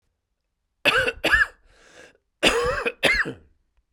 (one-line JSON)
{"cough_length": "3.9 s", "cough_amplitude": 21385, "cough_signal_mean_std_ratio": 0.46, "survey_phase": "beta (2021-08-13 to 2022-03-07)", "age": "45-64", "gender": "Male", "wearing_mask": "No", "symptom_cough_any": true, "symptom_new_continuous_cough": true, "symptom_runny_or_blocked_nose": true, "symptom_fatigue": true, "smoker_status": "Ex-smoker", "respiratory_condition_asthma": false, "respiratory_condition_other": false, "recruitment_source": "Test and Trace", "submission_delay": "2 days", "covid_test_result": "Positive", "covid_test_method": "RT-qPCR"}